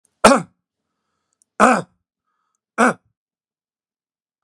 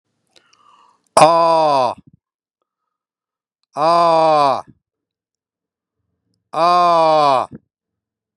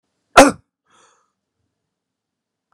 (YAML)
three_cough_length: 4.4 s
three_cough_amplitude: 32768
three_cough_signal_mean_std_ratio: 0.24
exhalation_length: 8.4 s
exhalation_amplitude: 32768
exhalation_signal_mean_std_ratio: 0.44
cough_length: 2.7 s
cough_amplitude: 32768
cough_signal_mean_std_ratio: 0.17
survey_phase: beta (2021-08-13 to 2022-03-07)
age: 65+
gender: Male
wearing_mask: 'No'
symptom_none: true
smoker_status: Never smoked
respiratory_condition_asthma: false
respiratory_condition_other: true
recruitment_source: REACT
submission_delay: 4 days
covid_test_result: Negative
covid_test_method: RT-qPCR
influenza_a_test_result: Negative
influenza_b_test_result: Negative